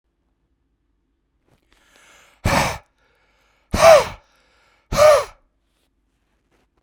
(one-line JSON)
{"exhalation_length": "6.8 s", "exhalation_amplitude": 32768, "exhalation_signal_mean_std_ratio": 0.28, "survey_phase": "beta (2021-08-13 to 2022-03-07)", "age": "45-64", "gender": "Male", "wearing_mask": "No", "symptom_none": true, "smoker_status": "Never smoked", "respiratory_condition_asthma": false, "respiratory_condition_other": false, "recruitment_source": "Test and Trace", "submission_delay": "4 days", "covid_test_result": "Negative", "covid_test_method": "RT-qPCR"}